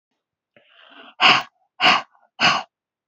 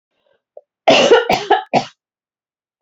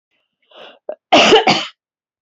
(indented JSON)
{
  "exhalation_length": "3.1 s",
  "exhalation_amplitude": 29214,
  "exhalation_signal_mean_std_ratio": 0.36,
  "three_cough_length": "2.8 s",
  "three_cough_amplitude": 32767,
  "three_cough_signal_mean_std_ratio": 0.4,
  "cough_length": "2.2 s",
  "cough_amplitude": 29248,
  "cough_signal_mean_std_ratio": 0.4,
  "survey_phase": "beta (2021-08-13 to 2022-03-07)",
  "age": "45-64",
  "gender": "Female",
  "wearing_mask": "No",
  "symptom_none": true,
  "smoker_status": "Never smoked",
  "respiratory_condition_asthma": false,
  "respiratory_condition_other": false,
  "recruitment_source": "Test and Trace",
  "submission_delay": "2 days",
  "covid_test_result": "Negative",
  "covid_test_method": "LFT"
}